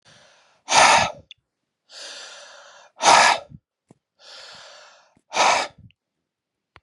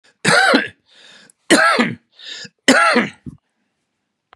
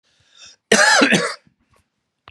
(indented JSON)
{
  "exhalation_length": "6.8 s",
  "exhalation_amplitude": 30333,
  "exhalation_signal_mean_std_ratio": 0.34,
  "three_cough_length": "4.4 s",
  "three_cough_amplitude": 32768,
  "three_cough_signal_mean_std_ratio": 0.46,
  "cough_length": "2.3 s",
  "cough_amplitude": 32767,
  "cough_signal_mean_std_ratio": 0.42,
  "survey_phase": "beta (2021-08-13 to 2022-03-07)",
  "age": "45-64",
  "gender": "Male",
  "wearing_mask": "No",
  "symptom_cough_any": true,
  "symptom_runny_or_blocked_nose": true,
  "symptom_shortness_of_breath": true,
  "symptom_sore_throat": true,
  "symptom_headache": true,
  "symptom_onset": "12 days",
  "smoker_status": "Never smoked",
  "respiratory_condition_asthma": false,
  "respiratory_condition_other": false,
  "recruitment_source": "REACT",
  "submission_delay": "2 days",
  "covid_test_result": "Negative",
  "covid_test_method": "RT-qPCR",
  "influenza_a_test_result": "Negative",
  "influenza_b_test_result": "Negative"
}